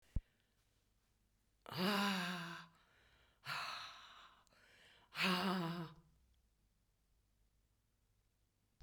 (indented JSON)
{
  "exhalation_length": "8.8 s",
  "exhalation_amplitude": 2171,
  "exhalation_signal_mean_std_ratio": 0.4,
  "survey_phase": "beta (2021-08-13 to 2022-03-07)",
  "age": "65+",
  "gender": "Female",
  "wearing_mask": "No",
  "symptom_cough_any": true,
  "smoker_status": "Never smoked",
  "respiratory_condition_asthma": false,
  "respiratory_condition_other": false,
  "recruitment_source": "REACT",
  "submission_delay": "1 day",
  "covid_test_result": "Negative",
  "covid_test_method": "RT-qPCR",
  "influenza_a_test_result": "Negative",
  "influenza_b_test_result": "Negative"
}